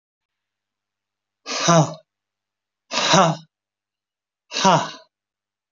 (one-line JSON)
{"exhalation_length": "5.7 s", "exhalation_amplitude": 28692, "exhalation_signal_mean_std_ratio": 0.33, "survey_phase": "alpha (2021-03-01 to 2021-08-12)", "age": "65+", "gender": "Male", "wearing_mask": "No", "symptom_none": true, "smoker_status": "Never smoked", "respiratory_condition_asthma": false, "respiratory_condition_other": false, "recruitment_source": "REACT", "submission_delay": "1 day", "covid_test_result": "Negative", "covid_test_method": "RT-qPCR"}